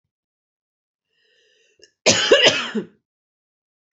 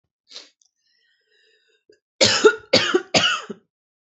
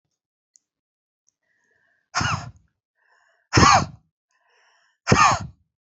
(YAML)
cough_length: 3.9 s
cough_amplitude: 29921
cough_signal_mean_std_ratio: 0.31
three_cough_length: 4.2 s
three_cough_amplitude: 26784
three_cough_signal_mean_std_ratio: 0.34
exhalation_length: 6.0 s
exhalation_amplitude: 27431
exhalation_signal_mean_std_ratio: 0.29
survey_phase: beta (2021-08-13 to 2022-03-07)
age: 18-44
gender: Female
wearing_mask: 'No'
symptom_cough_any: true
symptom_fatigue: true
symptom_headache: true
symptom_onset: 12 days
smoker_status: Ex-smoker
respiratory_condition_asthma: false
respiratory_condition_other: false
recruitment_source: REACT
submission_delay: 2 days
covid_test_result: Negative
covid_test_method: RT-qPCR
influenza_a_test_result: Unknown/Void
influenza_b_test_result: Unknown/Void